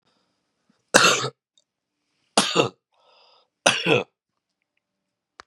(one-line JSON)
{"three_cough_length": "5.5 s", "three_cough_amplitude": 32768, "three_cough_signal_mean_std_ratio": 0.3, "survey_phase": "beta (2021-08-13 to 2022-03-07)", "age": "45-64", "gender": "Female", "wearing_mask": "No", "symptom_cough_any": true, "symptom_new_continuous_cough": true, "symptom_runny_or_blocked_nose": true, "symptom_sore_throat": true, "symptom_fatigue": true, "symptom_fever_high_temperature": true, "symptom_headache": true, "symptom_onset": "6 days", "smoker_status": "Never smoked", "respiratory_condition_asthma": false, "respiratory_condition_other": false, "recruitment_source": "Test and Trace", "submission_delay": "4 days", "covid_test_result": "Positive", "covid_test_method": "ePCR"}